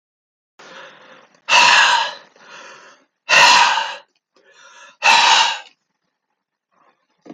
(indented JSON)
{
  "exhalation_length": "7.3 s",
  "exhalation_amplitude": 30916,
  "exhalation_signal_mean_std_ratio": 0.41,
  "survey_phase": "beta (2021-08-13 to 2022-03-07)",
  "age": "65+",
  "gender": "Male",
  "wearing_mask": "No",
  "symptom_none": true,
  "smoker_status": "Never smoked",
  "respiratory_condition_asthma": false,
  "respiratory_condition_other": false,
  "recruitment_source": "REACT",
  "submission_delay": "0 days",
  "covid_test_result": "Negative",
  "covid_test_method": "RT-qPCR"
}